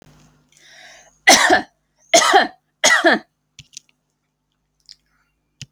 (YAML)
three_cough_length: 5.7 s
three_cough_amplitude: 32768
three_cough_signal_mean_std_ratio: 0.34
survey_phase: alpha (2021-03-01 to 2021-08-12)
age: 45-64
gender: Female
wearing_mask: 'No'
symptom_diarrhoea: true
symptom_headache: true
smoker_status: Never smoked
respiratory_condition_asthma: false
respiratory_condition_other: false
recruitment_source: REACT
submission_delay: 2 days
covid_test_result: Negative
covid_test_method: RT-qPCR